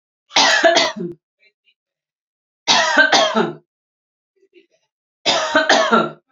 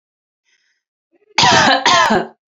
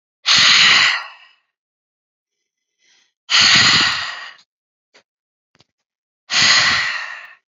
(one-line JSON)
{"three_cough_length": "6.3 s", "three_cough_amplitude": 32768, "three_cough_signal_mean_std_ratio": 0.49, "cough_length": "2.5 s", "cough_amplitude": 32767, "cough_signal_mean_std_ratio": 0.5, "exhalation_length": "7.6 s", "exhalation_amplitude": 32466, "exhalation_signal_mean_std_ratio": 0.46, "survey_phase": "beta (2021-08-13 to 2022-03-07)", "age": "18-44", "gender": "Female", "wearing_mask": "No", "symptom_none": true, "smoker_status": "Never smoked", "respiratory_condition_asthma": false, "respiratory_condition_other": false, "recruitment_source": "REACT", "submission_delay": "1 day", "covid_test_result": "Negative", "covid_test_method": "RT-qPCR", "influenza_a_test_result": "Negative", "influenza_b_test_result": "Negative"}